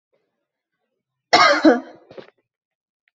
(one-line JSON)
{"cough_length": "3.2 s", "cough_amplitude": 29374, "cough_signal_mean_std_ratio": 0.3, "survey_phase": "beta (2021-08-13 to 2022-03-07)", "age": "18-44", "gender": "Female", "wearing_mask": "No", "symptom_runny_or_blocked_nose": true, "symptom_sore_throat": true, "symptom_onset": "4 days", "smoker_status": "Never smoked", "respiratory_condition_asthma": false, "respiratory_condition_other": false, "recruitment_source": "REACT", "submission_delay": "2 days", "covid_test_result": "Negative", "covid_test_method": "RT-qPCR", "influenza_a_test_result": "Negative", "influenza_b_test_result": "Negative"}